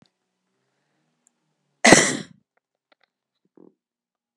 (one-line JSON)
{"cough_length": "4.4 s", "cough_amplitude": 32768, "cough_signal_mean_std_ratio": 0.19, "survey_phase": "beta (2021-08-13 to 2022-03-07)", "age": "45-64", "gender": "Female", "wearing_mask": "No", "symptom_cough_any": true, "symptom_fever_high_temperature": true, "symptom_change_to_sense_of_smell_or_taste": true, "symptom_onset": "6 days", "smoker_status": "Never smoked", "respiratory_condition_asthma": false, "respiratory_condition_other": false, "recruitment_source": "Test and Trace", "submission_delay": "2 days", "covid_test_result": "Positive", "covid_test_method": "RT-qPCR"}